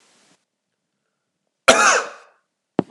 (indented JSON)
{
  "cough_length": "2.9 s",
  "cough_amplitude": 32768,
  "cough_signal_mean_std_ratio": 0.28,
  "survey_phase": "beta (2021-08-13 to 2022-03-07)",
  "age": "45-64",
  "gender": "Male",
  "wearing_mask": "No",
  "symptom_none": true,
  "smoker_status": "Current smoker (1 to 10 cigarettes per day)",
  "respiratory_condition_asthma": false,
  "respiratory_condition_other": false,
  "recruitment_source": "REACT",
  "submission_delay": "3 days",
  "covid_test_result": "Negative",
  "covid_test_method": "RT-qPCR",
  "influenza_a_test_result": "Negative",
  "influenza_b_test_result": "Negative"
}